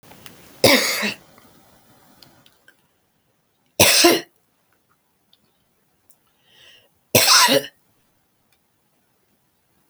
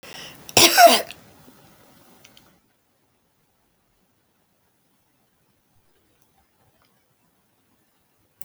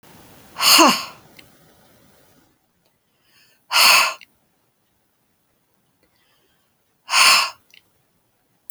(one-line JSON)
{"three_cough_length": "9.9 s", "three_cough_amplitude": 32768, "three_cough_signal_mean_std_ratio": 0.29, "cough_length": "8.4 s", "cough_amplitude": 32768, "cough_signal_mean_std_ratio": 0.19, "exhalation_length": "8.7 s", "exhalation_amplitude": 32768, "exhalation_signal_mean_std_ratio": 0.3, "survey_phase": "alpha (2021-03-01 to 2021-08-12)", "age": "65+", "gender": "Female", "wearing_mask": "No", "symptom_none": true, "smoker_status": "Never smoked", "respiratory_condition_asthma": false, "respiratory_condition_other": false, "recruitment_source": "REACT", "submission_delay": "2 days", "covid_test_result": "Negative", "covid_test_method": "RT-qPCR"}